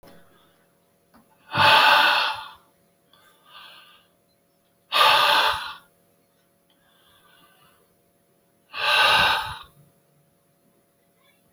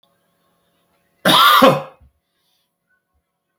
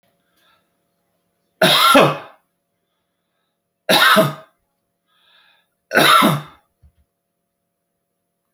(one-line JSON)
{"exhalation_length": "11.5 s", "exhalation_amplitude": 22761, "exhalation_signal_mean_std_ratio": 0.37, "cough_length": "3.6 s", "cough_amplitude": 30929, "cough_signal_mean_std_ratio": 0.32, "three_cough_length": "8.5 s", "three_cough_amplitude": 32610, "three_cough_signal_mean_std_ratio": 0.34, "survey_phase": "beta (2021-08-13 to 2022-03-07)", "age": "65+", "gender": "Male", "wearing_mask": "No", "symptom_none": true, "smoker_status": "Ex-smoker", "respiratory_condition_asthma": false, "respiratory_condition_other": false, "recruitment_source": "REACT", "submission_delay": "5 days", "covid_test_result": "Negative", "covid_test_method": "RT-qPCR"}